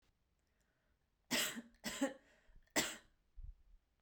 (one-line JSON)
{"three_cough_length": "4.0 s", "three_cough_amplitude": 2784, "three_cough_signal_mean_std_ratio": 0.36, "survey_phase": "beta (2021-08-13 to 2022-03-07)", "age": "18-44", "gender": "Female", "wearing_mask": "No", "symptom_none": true, "smoker_status": "Never smoked", "respiratory_condition_asthma": false, "respiratory_condition_other": false, "recruitment_source": "REACT", "submission_delay": "11 days", "covid_test_result": "Negative", "covid_test_method": "RT-qPCR"}